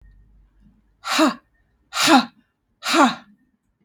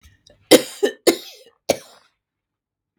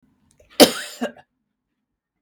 exhalation_length: 3.8 s
exhalation_amplitude: 32469
exhalation_signal_mean_std_ratio: 0.37
three_cough_length: 3.0 s
three_cough_amplitude: 32768
three_cough_signal_mean_std_ratio: 0.24
cough_length: 2.2 s
cough_amplitude: 32768
cough_signal_mean_std_ratio: 0.2
survey_phase: beta (2021-08-13 to 2022-03-07)
age: 45-64
gender: Female
wearing_mask: 'No'
symptom_none: true
smoker_status: Never smoked
respiratory_condition_asthma: false
respiratory_condition_other: false
recruitment_source: REACT
submission_delay: 1 day
covid_test_result: Negative
covid_test_method: RT-qPCR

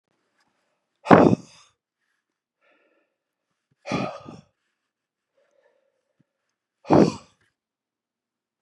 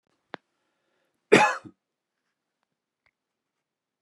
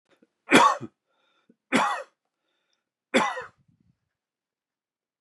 exhalation_length: 8.6 s
exhalation_amplitude: 32768
exhalation_signal_mean_std_ratio: 0.2
cough_length: 4.0 s
cough_amplitude: 26335
cough_signal_mean_std_ratio: 0.17
three_cough_length: 5.2 s
three_cough_amplitude: 29326
three_cough_signal_mean_std_ratio: 0.28
survey_phase: beta (2021-08-13 to 2022-03-07)
age: 45-64
gender: Male
wearing_mask: 'No'
symptom_none: true
symptom_onset: 4 days
smoker_status: Never smoked
respiratory_condition_asthma: false
respiratory_condition_other: false
recruitment_source: REACT
submission_delay: 1 day
covid_test_result: Negative
covid_test_method: RT-qPCR
influenza_a_test_result: Negative
influenza_b_test_result: Negative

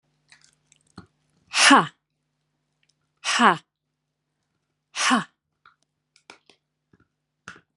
exhalation_length: 7.8 s
exhalation_amplitude: 29615
exhalation_signal_mean_std_ratio: 0.24
survey_phase: beta (2021-08-13 to 2022-03-07)
age: 45-64
gender: Female
wearing_mask: 'No'
symptom_cough_any: true
symptom_sore_throat: true
symptom_fatigue: true
symptom_headache: true
symptom_other: true
symptom_onset: 3 days
smoker_status: Never smoked
respiratory_condition_asthma: false
respiratory_condition_other: false
recruitment_source: Test and Trace
submission_delay: 1 day
covid_test_result: Positive
covid_test_method: RT-qPCR
covid_ct_value: 22.5
covid_ct_gene: N gene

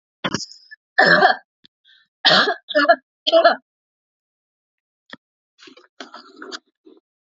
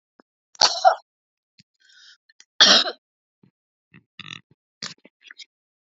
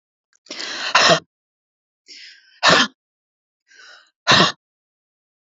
three_cough_length: 7.3 s
three_cough_amplitude: 32767
three_cough_signal_mean_std_ratio: 0.34
cough_length: 6.0 s
cough_amplitude: 32767
cough_signal_mean_std_ratio: 0.23
exhalation_length: 5.5 s
exhalation_amplitude: 31804
exhalation_signal_mean_std_ratio: 0.32
survey_phase: alpha (2021-03-01 to 2021-08-12)
age: 45-64
gender: Female
wearing_mask: 'No'
symptom_none: true
smoker_status: Never smoked
respiratory_condition_asthma: true
respiratory_condition_other: false
recruitment_source: REACT
submission_delay: 1 day
covid_test_result: Negative
covid_test_method: RT-qPCR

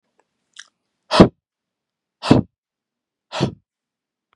exhalation_length: 4.4 s
exhalation_amplitude: 32768
exhalation_signal_mean_std_ratio: 0.21
survey_phase: beta (2021-08-13 to 2022-03-07)
age: 45-64
gender: Male
wearing_mask: 'No'
symptom_cough_any: true
symptom_onset: 7 days
smoker_status: Ex-smoker
respiratory_condition_asthma: false
respiratory_condition_other: false
recruitment_source: REACT
submission_delay: 2 days
covid_test_result: Negative
covid_test_method: RT-qPCR
influenza_a_test_result: Negative
influenza_b_test_result: Negative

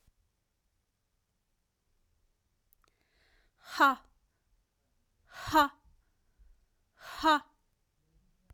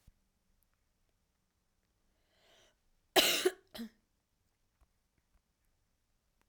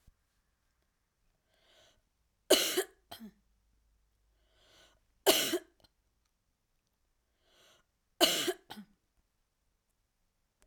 exhalation_length: 8.5 s
exhalation_amplitude: 9082
exhalation_signal_mean_std_ratio: 0.21
cough_length: 6.5 s
cough_amplitude: 9058
cough_signal_mean_std_ratio: 0.19
three_cough_length: 10.7 s
three_cough_amplitude: 10921
three_cough_signal_mean_std_ratio: 0.23
survey_phase: beta (2021-08-13 to 2022-03-07)
age: 18-44
gender: Female
wearing_mask: 'No'
symptom_cough_any: true
symptom_runny_or_blocked_nose: true
symptom_headache: true
smoker_status: Never smoked
respiratory_condition_asthma: false
respiratory_condition_other: false
recruitment_source: Test and Trace
submission_delay: 2 days
covid_test_result: Positive
covid_test_method: RT-qPCR
covid_ct_value: 14.9
covid_ct_gene: ORF1ab gene
covid_ct_mean: 15.0
covid_viral_load: 12000000 copies/ml
covid_viral_load_category: High viral load (>1M copies/ml)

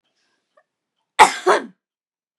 three_cough_length: 2.4 s
three_cough_amplitude: 32768
three_cough_signal_mean_std_ratio: 0.25
survey_phase: beta (2021-08-13 to 2022-03-07)
age: 18-44
gender: Female
wearing_mask: 'No'
symptom_none: true
smoker_status: Never smoked
respiratory_condition_asthma: false
respiratory_condition_other: false
recruitment_source: REACT
submission_delay: 4 days
covid_test_result: Negative
covid_test_method: RT-qPCR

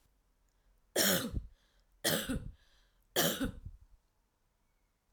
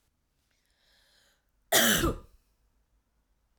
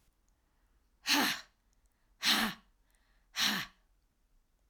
three_cough_length: 5.1 s
three_cough_amplitude: 5612
three_cough_signal_mean_std_ratio: 0.39
cough_length: 3.6 s
cough_amplitude: 11449
cough_signal_mean_std_ratio: 0.28
exhalation_length: 4.7 s
exhalation_amplitude: 5564
exhalation_signal_mean_std_ratio: 0.36
survey_phase: alpha (2021-03-01 to 2021-08-12)
age: 45-64
gender: Female
wearing_mask: 'No'
symptom_none: true
smoker_status: Never smoked
respiratory_condition_asthma: false
respiratory_condition_other: false
recruitment_source: REACT
submission_delay: 2 days
covid_test_result: Negative
covid_test_method: RT-qPCR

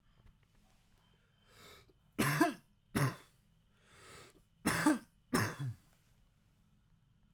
cough_length: 7.3 s
cough_amplitude: 5815
cough_signal_mean_std_ratio: 0.35
survey_phase: beta (2021-08-13 to 2022-03-07)
age: 18-44
gender: Male
wearing_mask: 'No'
symptom_cough_any: true
symptom_runny_or_blocked_nose: true
symptom_sore_throat: true
symptom_fatigue: true
symptom_headache: true
smoker_status: Never smoked
respiratory_condition_asthma: false
respiratory_condition_other: false
recruitment_source: Test and Trace
submission_delay: 0 days
covid_test_result: Positive
covid_test_method: LFT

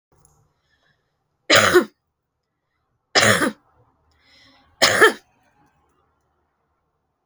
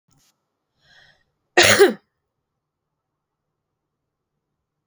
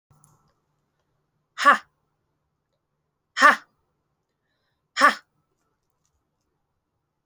three_cough_length: 7.3 s
three_cough_amplitude: 32126
three_cough_signal_mean_std_ratio: 0.28
cough_length: 4.9 s
cough_amplitude: 32768
cough_signal_mean_std_ratio: 0.21
exhalation_length: 7.3 s
exhalation_amplitude: 30086
exhalation_signal_mean_std_ratio: 0.19
survey_phase: alpha (2021-03-01 to 2021-08-12)
age: 18-44
gender: Female
wearing_mask: 'No'
symptom_none: true
smoker_status: Never smoked
respiratory_condition_asthma: true
respiratory_condition_other: false
recruitment_source: Test and Trace
submission_delay: 1 day
covid_test_result: Positive
covid_test_method: RT-qPCR
covid_ct_value: 25.0
covid_ct_gene: ORF1ab gene
covid_ct_mean: 25.5
covid_viral_load: 4300 copies/ml
covid_viral_load_category: Minimal viral load (< 10K copies/ml)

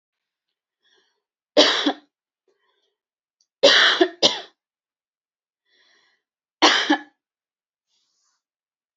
three_cough_length: 9.0 s
three_cough_amplitude: 31005
three_cough_signal_mean_std_ratio: 0.28
survey_phase: beta (2021-08-13 to 2022-03-07)
age: 18-44
gender: Female
wearing_mask: 'No'
symptom_none: true
smoker_status: Never smoked
respiratory_condition_asthma: false
respiratory_condition_other: false
recruitment_source: REACT
submission_delay: 2 days
covid_test_result: Negative
covid_test_method: RT-qPCR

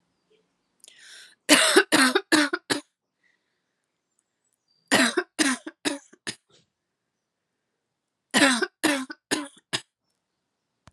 three_cough_length: 10.9 s
three_cough_amplitude: 28278
three_cough_signal_mean_std_ratio: 0.33
survey_phase: alpha (2021-03-01 to 2021-08-12)
age: 18-44
gender: Female
wearing_mask: 'No'
symptom_cough_any: true
symptom_fatigue: true
symptom_headache: true
smoker_status: Never smoked
respiratory_condition_asthma: false
respiratory_condition_other: false
recruitment_source: Test and Trace
submission_delay: 2 days
covid_test_result: Positive
covid_test_method: RT-qPCR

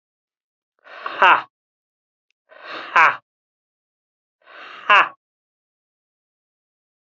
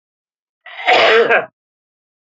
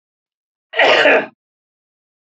exhalation_length: 7.2 s
exhalation_amplitude: 28587
exhalation_signal_mean_std_ratio: 0.24
cough_length: 2.4 s
cough_amplitude: 32768
cough_signal_mean_std_ratio: 0.43
three_cough_length: 2.2 s
three_cough_amplitude: 29986
three_cough_signal_mean_std_ratio: 0.39
survey_phase: beta (2021-08-13 to 2022-03-07)
age: 45-64
gender: Male
wearing_mask: 'No'
symptom_cough_any: true
symptom_runny_or_blocked_nose: true
symptom_onset: 7 days
smoker_status: Never smoked
respiratory_condition_asthma: true
respiratory_condition_other: false
recruitment_source: Test and Trace
submission_delay: 2 days
covid_test_result: Positive
covid_test_method: RT-qPCR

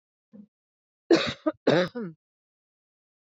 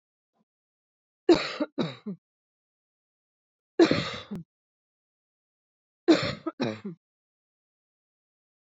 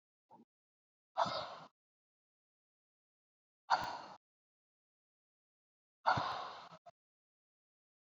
cough_length: 3.2 s
cough_amplitude: 14482
cough_signal_mean_std_ratio: 0.3
three_cough_length: 8.7 s
three_cough_amplitude: 14673
three_cough_signal_mean_std_ratio: 0.26
exhalation_length: 8.1 s
exhalation_amplitude: 4574
exhalation_signal_mean_std_ratio: 0.26
survey_phase: alpha (2021-03-01 to 2021-08-12)
age: 45-64
gender: Female
wearing_mask: 'No'
symptom_cough_any: true
symptom_abdominal_pain: true
symptom_fatigue: true
symptom_headache: true
smoker_status: Never smoked
respiratory_condition_asthma: true
respiratory_condition_other: false
recruitment_source: Test and Trace
submission_delay: 2 days
covid_test_result: Positive
covid_test_method: RT-qPCR
covid_ct_value: 26.9
covid_ct_gene: ORF1ab gene
covid_ct_mean: 27.3
covid_viral_load: 1100 copies/ml
covid_viral_load_category: Minimal viral load (< 10K copies/ml)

